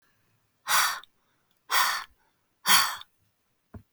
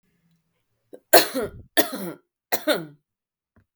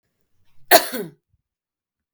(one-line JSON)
{"exhalation_length": "3.9 s", "exhalation_amplitude": 23743, "exhalation_signal_mean_std_ratio": 0.37, "three_cough_length": "3.8 s", "three_cough_amplitude": 32768, "three_cough_signal_mean_std_ratio": 0.28, "cough_length": "2.1 s", "cough_amplitude": 32768, "cough_signal_mean_std_ratio": 0.22, "survey_phase": "beta (2021-08-13 to 2022-03-07)", "age": "18-44", "gender": "Female", "wearing_mask": "No", "symptom_none": true, "smoker_status": "Never smoked", "respiratory_condition_asthma": false, "respiratory_condition_other": false, "recruitment_source": "REACT", "submission_delay": "1 day", "covid_test_result": "Negative", "covid_test_method": "RT-qPCR", "influenza_a_test_result": "Negative", "influenza_b_test_result": "Negative"}